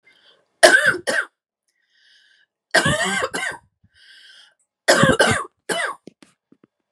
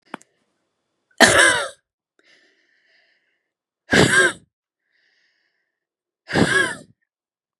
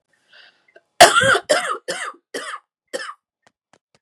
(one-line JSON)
{"three_cough_length": "6.9 s", "three_cough_amplitude": 32768, "three_cough_signal_mean_std_ratio": 0.39, "exhalation_length": "7.6 s", "exhalation_amplitude": 32768, "exhalation_signal_mean_std_ratio": 0.32, "cough_length": "4.0 s", "cough_amplitude": 32768, "cough_signal_mean_std_ratio": 0.32, "survey_phase": "beta (2021-08-13 to 2022-03-07)", "age": "18-44", "gender": "Female", "wearing_mask": "No", "symptom_none": true, "smoker_status": "Ex-smoker", "respiratory_condition_asthma": false, "respiratory_condition_other": false, "recruitment_source": "REACT", "submission_delay": "1 day", "covid_test_result": "Negative", "covid_test_method": "RT-qPCR", "influenza_a_test_result": "Negative", "influenza_b_test_result": "Negative"}